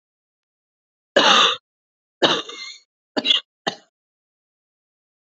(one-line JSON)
{"cough_length": "5.4 s", "cough_amplitude": 29120, "cough_signal_mean_std_ratio": 0.31, "survey_phase": "alpha (2021-03-01 to 2021-08-12)", "age": "45-64", "gender": "Female", "wearing_mask": "No", "symptom_cough_any": true, "symptom_fever_high_temperature": true, "symptom_headache": true, "symptom_onset": "3 days", "smoker_status": "Never smoked", "respiratory_condition_asthma": false, "respiratory_condition_other": false, "recruitment_source": "Test and Trace", "submission_delay": "1 day", "covid_test_result": "Positive", "covid_test_method": "RT-qPCR"}